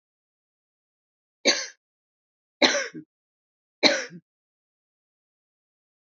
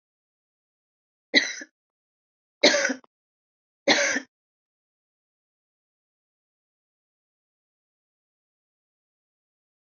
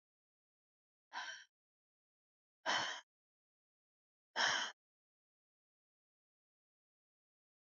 {"three_cough_length": "6.1 s", "three_cough_amplitude": 31830, "three_cough_signal_mean_std_ratio": 0.23, "cough_length": "9.9 s", "cough_amplitude": 22931, "cough_signal_mean_std_ratio": 0.2, "exhalation_length": "7.7 s", "exhalation_amplitude": 3109, "exhalation_signal_mean_std_ratio": 0.25, "survey_phase": "alpha (2021-03-01 to 2021-08-12)", "age": "65+", "gender": "Female", "wearing_mask": "No", "symptom_cough_any": true, "symptom_shortness_of_breath": true, "smoker_status": "Current smoker (1 to 10 cigarettes per day)", "respiratory_condition_asthma": false, "respiratory_condition_other": true, "recruitment_source": "REACT", "submission_delay": "1 day", "covid_test_result": "Negative", "covid_test_method": "RT-qPCR"}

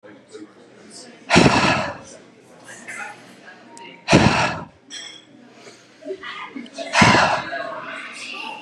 {"exhalation_length": "8.6 s", "exhalation_amplitude": 32728, "exhalation_signal_mean_std_ratio": 0.45, "survey_phase": "beta (2021-08-13 to 2022-03-07)", "age": "18-44", "gender": "Male", "wearing_mask": "No", "symptom_none": true, "smoker_status": "Never smoked", "respiratory_condition_asthma": false, "respiratory_condition_other": false, "recruitment_source": "REACT", "submission_delay": "1 day", "covid_test_result": "Negative", "covid_test_method": "RT-qPCR", "influenza_a_test_result": "Negative", "influenza_b_test_result": "Negative"}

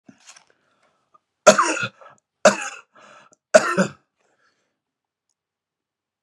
{"three_cough_length": "6.2 s", "three_cough_amplitude": 32768, "three_cough_signal_mean_std_ratio": 0.24, "survey_phase": "beta (2021-08-13 to 2022-03-07)", "age": "65+", "gender": "Male", "wearing_mask": "No", "symptom_none": true, "smoker_status": "Never smoked", "respiratory_condition_asthma": false, "respiratory_condition_other": false, "recruitment_source": "REACT", "submission_delay": "2 days", "covid_test_result": "Negative", "covid_test_method": "RT-qPCR"}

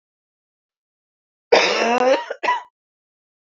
{"cough_length": "3.6 s", "cough_amplitude": 27232, "cough_signal_mean_std_ratio": 0.4, "survey_phase": "beta (2021-08-13 to 2022-03-07)", "age": "65+", "gender": "Female", "wearing_mask": "No", "symptom_cough_any": true, "symptom_runny_or_blocked_nose": true, "symptom_sore_throat": true, "symptom_fatigue": true, "symptom_change_to_sense_of_smell_or_taste": true, "symptom_onset": "3 days", "smoker_status": "Never smoked", "respiratory_condition_asthma": false, "respiratory_condition_other": true, "recruitment_source": "Test and Trace", "submission_delay": "1 day", "covid_test_result": "Positive", "covid_test_method": "RT-qPCR", "covid_ct_value": 18.2, "covid_ct_gene": "N gene"}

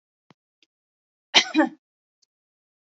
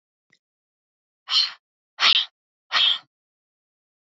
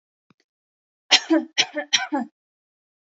{"cough_length": "2.8 s", "cough_amplitude": 30432, "cough_signal_mean_std_ratio": 0.22, "exhalation_length": "4.1 s", "exhalation_amplitude": 21670, "exhalation_signal_mean_std_ratio": 0.32, "three_cough_length": "3.2 s", "three_cough_amplitude": 32767, "three_cough_signal_mean_std_ratio": 0.32, "survey_phase": "alpha (2021-03-01 to 2021-08-12)", "age": "18-44", "gender": "Female", "wearing_mask": "No", "symptom_none": true, "symptom_onset": "12 days", "smoker_status": "Never smoked", "respiratory_condition_asthma": false, "respiratory_condition_other": false, "recruitment_source": "REACT", "submission_delay": "1 day", "covid_test_result": "Negative", "covid_test_method": "RT-qPCR"}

